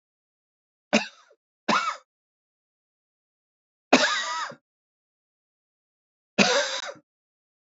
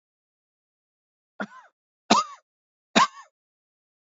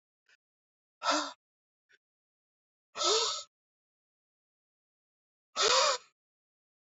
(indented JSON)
{
  "three_cough_length": "7.8 s",
  "three_cough_amplitude": 24065,
  "three_cough_signal_mean_std_ratio": 0.3,
  "cough_length": "4.0 s",
  "cough_amplitude": 26001,
  "cough_signal_mean_std_ratio": 0.21,
  "exhalation_length": "7.0 s",
  "exhalation_amplitude": 6242,
  "exhalation_signal_mean_std_ratio": 0.31,
  "survey_phase": "beta (2021-08-13 to 2022-03-07)",
  "age": "45-64",
  "gender": "Male",
  "wearing_mask": "No",
  "symptom_none": true,
  "smoker_status": "Never smoked",
  "respiratory_condition_asthma": false,
  "respiratory_condition_other": false,
  "recruitment_source": "REACT",
  "submission_delay": "2 days",
  "covid_test_result": "Negative",
  "covid_test_method": "RT-qPCR",
  "influenza_a_test_result": "Negative",
  "influenza_b_test_result": "Negative"
}